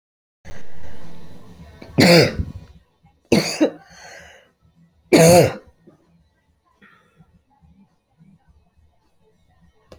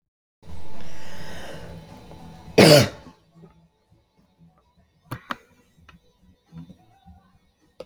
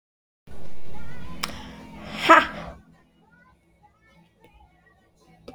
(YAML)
three_cough_length: 10.0 s
three_cough_amplitude: 32768
three_cough_signal_mean_std_ratio: 0.35
cough_length: 7.9 s
cough_amplitude: 32767
cough_signal_mean_std_ratio: 0.33
exhalation_length: 5.5 s
exhalation_amplitude: 28752
exhalation_signal_mean_std_ratio: 0.43
survey_phase: beta (2021-08-13 to 2022-03-07)
age: 65+
gender: Female
wearing_mask: 'No'
symptom_none: true
smoker_status: Never smoked
respiratory_condition_asthma: false
respiratory_condition_other: false
recruitment_source: REACT
submission_delay: 1 day
covid_test_result: Negative
covid_test_method: RT-qPCR